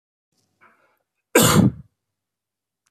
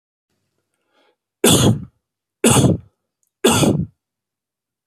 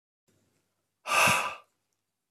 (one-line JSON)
{"cough_length": "2.9 s", "cough_amplitude": 29999, "cough_signal_mean_std_ratio": 0.29, "three_cough_length": "4.9 s", "three_cough_amplitude": 32768, "three_cough_signal_mean_std_ratio": 0.39, "exhalation_length": "2.3 s", "exhalation_amplitude": 10506, "exhalation_signal_mean_std_ratio": 0.35, "survey_phase": "beta (2021-08-13 to 2022-03-07)", "age": "45-64", "gender": "Male", "wearing_mask": "No", "symptom_none": true, "smoker_status": "Never smoked", "respiratory_condition_asthma": false, "respiratory_condition_other": false, "recruitment_source": "REACT", "submission_delay": "4 days", "covid_test_result": "Negative", "covid_test_method": "RT-qPCR"}